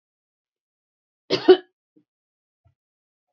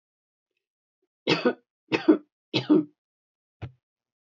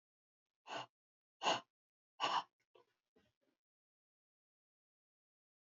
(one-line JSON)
{"cough_length": "3.3 s", "cough_amplitude": 27918, "cough_signal_mean_std_ratio": 0.16, "three_cough_length": "4.3 s", "three_cough_amplitude": 15830, "three_cough_signal_mean_std_ratio": 0.29, "exhalation_length": "5.7 s", "exhalation_amplitude": 2278, "exhalation_signal_mean_std_ratio": 0.23, "survey_phase": "beta (2021-08-13 to 2022-03-07)", "age": "65+", "gender": "Female", "wearing_mask": "No", "symptom_none": true, "smoker_status": "Never smoked", "respiratory_condition_asthma": true, "respiratory_condition_other": false, "recruitment_source": "Test and Trace", "submission_delay": "1 day", "covid_test_result": "Positive", "covid_test_method": "ePCR"}